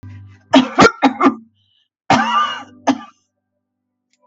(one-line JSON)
{"cough_length": "4.3 s", "cough_amplitude": 32768, "cough_signal_mean_std_ratio": 0.41, "survey_phase": "beta (2021-08-13 to 2022-03-07)", "age": "65+", "gender": "Female", "wearing_mask": "No", "symptom_none": true, "smoker_status": "Prefer not to say", "respiratory_condition_asthma": false, "respiratory_condition_other": false, "recruitment_source": "REACT", "submission_delay": "3 days", "covid_test_result": "Negative", "covid_test_method": "RT-qPCR", "influenza_a_test_result": "Negative", "influenza_b_test_result": "Negative"}